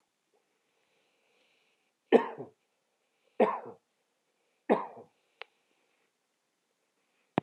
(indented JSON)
{
  "three_cough_length": "7.4 s",
  "three_cough_amplitude": 13332,
  "three_cough_signal_mean_std_ratio": 0.18,
  "survey_phase": "beta (2021-08-13 to 2022-03-07)",
  "age": "45-64",
  "gender": "Male",
  "wearing_mask": "No",
  "symptom_none": true,
  "smoker_status": "Ex-smoker",
  "respiratory_condition_asthma": false,
  "respiratory_condition_other": false,
  "recruitment_source": "REACT",
  "submission_delay": "2 days",
  "covid_test_result": "Negative",
  "covid_test_method": "RT-qPCR"
}